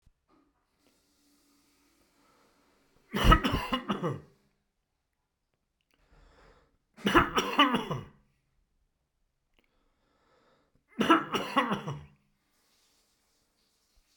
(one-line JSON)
{"three_cough_length": "14.2 s", "three_cough_amplitude": 16858, "three_cough_signal_mean_std_ratio": 0.29, "survey_phase": "beta (2021-08-13 to 2022-03-07)", "age": "65+", "gender": "Male", "wearing_mask": "No", "symptom_cough_any": true, "symptom_runny_or_blocked_nose": true, "symptom_headache": true, "smoker_status": "Ex-smoker", "respiratory_condition_asthma": false, "respiratory_condition_other": false, "recruitment_source": "Test and Trace", "submission_delay": "1 day", "covid_test_result": "Positive", "covid_test_method": "RT-qPCR", "covid_ct_value": 30.3, "covid_ct_gene": "ORF1ab gene", "covid_ct_mean": 31.7, "covid_viral_load": "39 copies/ml", "covid_viral_load_category": "Minimal viral load (< 10K copies/ml)"}